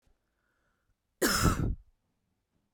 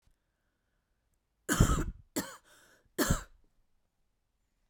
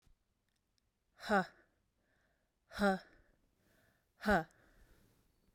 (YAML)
cough_length: 2.7 s
cough_amplitude: 7974
cough_signal_mean_std_ratio: 0.35
three_cough_length: 4.7 s
three_cough_amplitude: 10597
three_cough_signal_mean_std_ratio: 0.29
exhalation_length: 5.5 s
exhalation_amplitude: 3214
exhalation_signal_mean_std_ratio: 0.27
survey_phase: beta (2021-08-13 to 2022-03-07)
age: 18-44
gender: Female
wearing_mask: 'No'
symptom_cough_any: true
symptom_runny_or_blocked_nose: true
symptom_sore_throat: true
symptom_fatigue: true
symptom_onset: 4 days
smoker_status: Never smoked
respiratory_condition_asthma: false
respiratory_condition_other: false
recruitment_source: Test and Trace
submission_delay: 1 day
covid_test_result: Positive
covid_test_method: RT-qPCR
covid_ct_value: 26.4
covid_ct_gene: ORF1ab gene
covid_ct_mean: 27.1
covid_viral_load: 1300 copies/ml
covid_viral_load_category: Minimal viral load (< 10K copies/ml)